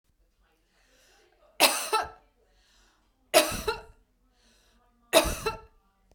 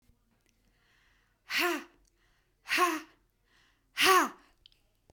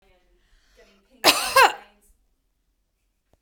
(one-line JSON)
{"three_cough_length": "6.1 s", "three_cough_amplitude": 24133, "three_cough_signal_mean_std_ratio": 0.3, "exhalation_length": "5.1 s", "exhalation_amplitude": 9809, "exhalation_signal_mean_std_ratio": 0.33, "cough_length": "3.4 s", "cough_amplitude": 32768, "cough_signal_mean_std_ratio": 0.25, "survey_phase": "beta (2021-08-13 to 2022-03-07)", "age": "45-64", "gender": "Female", "wearing_mask": "No", "symptom_none": true, "smoker_status": "Never smoked", "respiratory_condition_asthma": false, "respiratory_condition_other": false, "recruitment_source": "REACT", "submission_delay": "1 day", "covid_test_result": "Negative", "covid_test_method": "RT-qPCR"}